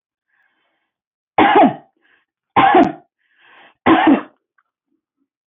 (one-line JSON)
{"three_cough_length": "5.5 s", "three_cough_amplitude": 26705, "three_cough_signal_mean_std_ratio": 0.37, "survey_phase": "beta (2021-08-13 to 2022-03-07)", "age": "65+", "gender": "Female", "wearing_mask": "No", "symptom_none": true, "smoker_status": "Ex-smoker", "respiratory_condition_asthma": false, "respiratory_condition_other": false, "recruitment_source": "REACT", "submission_delay": "1 day", "covid_test_result": "Negative", "covid_test_method": "RT-qPCR", "influenza_a_test_result": "Negative", "influenza_b_test_result": "Negative"}